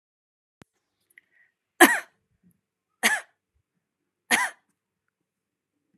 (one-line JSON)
{"three_cough_length": "6.0 s", "three_cough_amplitude": 29914, "three_cough_signal_mean_std_ratio": 0.19, "survey_phase": "beta (2021-08-13 to 2022-03-07)", "age": "18-44", "gender": "Female", "wearing_mask": "No", "symptom_none": true, "smoker_status": "Never smoked", "respiratory_condition_asthma": false, "respiratory_condition_other": false, "recruitment_source": "REACT", "submission_delay": "7 days", "covid_test_result": "Negative", "covid_test_method": "RT-qPCR", "influenza_a_test_result": "Negative", "influenza_b_test_result": "Negative"}